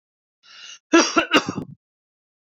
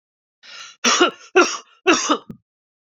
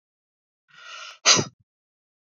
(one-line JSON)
{"cough_length": "2.5 s", "cough_amplitude": 29618, "cough_signal_mean_std_ratio": 0.33, "three_cough_length": "2.9 s", "three_cough_amplitude": 28215, "three_cough_signal_mean_std_ratio": 0.41, "exhalation_length": "2.3 s", "exhalation_amplitude": 26433, "exhalation_signal_mean_std_ratio": 0.24, "survey_phase": "beta (2021-08-13 to 2022-03-07)", "age": "45-64", "gender": "Male", "wearing_mask": "No", "symptom_cough_any": true, "symptom_runny_or_blocked_nose": true, "symptom_sore_throat": true, "symptom_fatigue": true, "symptom_fever_high_temperature": true, "symptom_headache": true, "symptom_onset": "4 days", "smoker_status": "Never smoked", "respiratory_condition_asthma": false, "respiratory_condition_other": false, "recruitment_source": "Test and Trace", "submission_delay": "2 days", "covid_test_result": "Positive", "covid_test_method": "RT-qPCR", "covid_ct_value": 15.5, "covid_ct_gene": "N gene", "covid_ct_mean": 16.1, "covid_viral_load": "5300000 copies/ml", "covid_viral_load_category": "High viral load (>1M copies/ml)"}